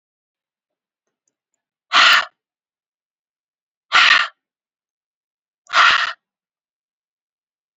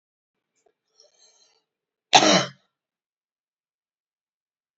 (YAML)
exhalation_length: 7.8 s
exhalation_amplitude: 29506
exhalation_signal_mean_std_ratio: 0.28
cough_length: 4.8 s
cough_amplitude: 28111
cough_signal_mean_std_ratio: 0.19
survey_phase: beta (2021-08-13 to 2022-03-07)
age: 65+
gender: Female
wearing_mask: 'No'
symptom_none: true
smoker_status: Ex-smoker
respiratory_condition_asthma: false
respiratory_condition_other: false
recruitment_source: REACT
submission_delay: 0 days
covid_test_result: Negative
covid_test_method: RT-qPCR
influenza_a_test_result: Negative
influenza_b_test_result: Negative